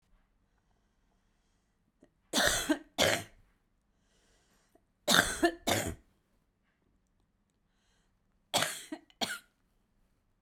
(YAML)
three_cough_length: 10.4 s
three_cough_amplitude: 17504
three_cough_signal_mean_std_ratio: 0.3
survey_phase: beta (2021-08-13 to 2022-03-07)
age: 45-64
gender: Female
wearing_mask: 'No'
symptom_cough_any: true
symptom_new_continuous_cough: true
symptom_runny_or_blocked_nose: true
symptom_sore_throat: true
symptom_fatigue: true
symptom_headache: true
symptom_onset: 2 days
smoker_status: Ex-smoker
respiratory_condition_asthma: false
respiratory_condition_other: false
recruitment_source: Test and Trace
submission_delay: 1 day
covid_test_result: Positive
covid_test_method: ePCR